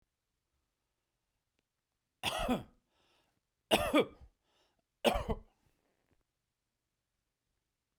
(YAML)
three_cough_length: 8.0 s
three_cough_amplitude: 7974
three_cough_signal_mean_std_ratio: 0.25
survey_phase: beta (2021-08-13 to 2022-03-07)
age: 45-64
gender: Male
wearing_mask: 'No'
symptom_none: true
smoker_status: Ex-smoker
respiratory_condition_asthma: false
respiratory_condition_other: false
recruitment_source: REACT
submission_delay: 1 day
covid_test_result: Negative
covid_test_method: RT-qPCR